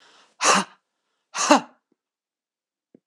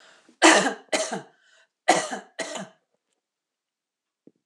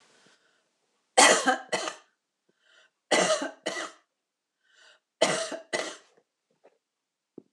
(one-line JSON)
{"exhalation_length": "3.1 s", "exhalation_amplitude": 26028, "exhalation_signal_mean_std_ratio": 0.28, "cough_length": "4.5 s", "cough_amplitude": 24627, "cough_signal_mean_std_ratio": 0.31, "three_cough_length": "7.5 s", "three_cough_amplitude": 20267, "three_cough_signal_mean_std_ratio": 0.32, "survey_phase": "alpha (2021-03-01 to 2021-08-12)", "age": "45-64", "gender": "Female", "wearing_mask": "No", "symptom_none": true, "smoker_status": "Ex-smoker", "respiratory_condition_asthma": true, "respiratory_condition_other": false, "recruitment_source": "Test and Trace", "submission_delay": "0 days", "covid_test_result": "Negative", "covid_test_method": "LFT"}